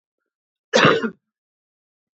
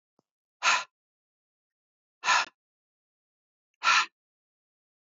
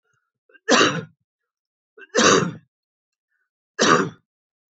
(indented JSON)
{
  "cough_length": "2.1 s",
  "cough_amplitude": 27384,
  "cough_signal_mean_std_ratio": 0.3,
  "exhalation_length": "5.0 s",
  "exhalation_amplitude": 10448,
  "exhalation_signal_mean_std_ratio": 0.27,
  "three_cough_length": "4.7 s",
  "three_cough_amplitude": 26983,
  "three_cough_signal_mean_std_ratio": 0.36,
  "survey_phase": "beta (2021-08-13 to 2022-03-07)",
  "age": "45-64",
  "gender": "Male",
  "wearing_mask": "No",
  "symptom_sore_throat": true,
  "symptom_change_to_sense_of_smell_or_taste": true,
  "symptom_other": true,
  "smoker_status": "Never smoked",
  "respiratory_condition_asthma": false,
  "respiratory_condition_other": false,
  "recruitment_source": "Test and Trace",
  "submission_delay": "2 days",
  "covid_test_result": "Positive",
  "covid_test_method": "LFT"
}